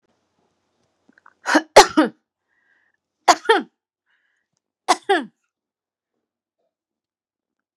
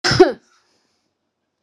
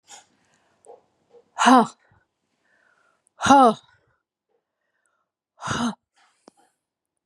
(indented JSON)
{
  "three_cough_length": "7.8 s",
  "three_cough_amplitude": 32768,
  "three_cough_signal_mean_std_ratio": 0.21,
  "cough_length": "1.6 s",
  "cough_amplitude": 32768,
  "cough_signal_mean_std_ratio": 0.28,
  "exhalation_length": "7.3 s",
  "exhalation_amplitude": 30415,
  "exhalation_signal_mean_std_ratio": 0.25,
  "survey_phase": "beta (2021-08-13 to 2022-03-07)",
  "age": "45-64",
  "gender": "Female",
  "wearing_mask": "No",
  "symptom_none": true,
  "smoker_status": "Ex-smoker",
  "respiratory_condition_asthma": false,
  "respiratory_condition_other": false,
  "recruitment_source": "REACT",
  "submission_delay": "3 days",
  "covid_test_result": "Negative",
  "covid_test_method": "RT-qPCR",
  "influenza_a_test_result": "Negative",
  "influenza_b_test_result": "Negative"
}